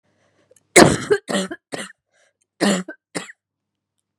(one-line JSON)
{"cough_length": "4.2 s", "cough_amplitude": 32768, "cough_signal_mean_std_ratio": 0.3, "survey_phase": "beta (2021-08-13 to 2022-03-07)", "age": "18-44", "gender": "Female", "wearing_mask": "No", "symptom_runny_or_blocked_nose": true, "symptom_fatigue": true, "symptom_headache": true, "smoker_status": "Never smoked", "respiratory_condition_asthma": false, "respiratory_condition_other": false, "recruitment_source": "Test and Trace", "submission_delay": "2 days", "covid_test_result": "Positive", "covid_test_method": "RT-qPCR"}